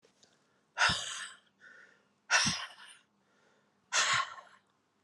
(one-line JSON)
{"exhalation_length": "5.0 s", "exhalation_amplitude": 7618, "exhalation_signal_mean_std_ratio": 0.38, "survey_phase": "alpha (2021-03-01 to 2021-08-12)", "age": "45-64", "gender": "Female", "wearing_mask": "No", "symptom_cough_any": true, "symptom_new_continuous_cough": true, "symptom_fatigue": true, "symptom_fever_high_temperature": true, "symptom_headache": true, "symptom_change_to_sense_of_smell_or_taste": true, "symptom_loss_of_taste": true, "symptom_onset": "5 days", "smoker_status": "Ex-smoker", "respiratory_condition_asthma": false, "respiratory_condition_other": false, "recruitment_source": "Test and Trace", "submission_delay": "2 days", "covid_test_result": "Positive", "covid_test_method": "RT-qPCR", "covid_ct_value": 18.5, "covid_ct_gene": "ORF1ab gene", "covid_ct_mean": 19.2, "covid_viral_load": "490000 copies/ml", "covid_viral_load_category": "Low viral load (10K-1M copies/ml)"}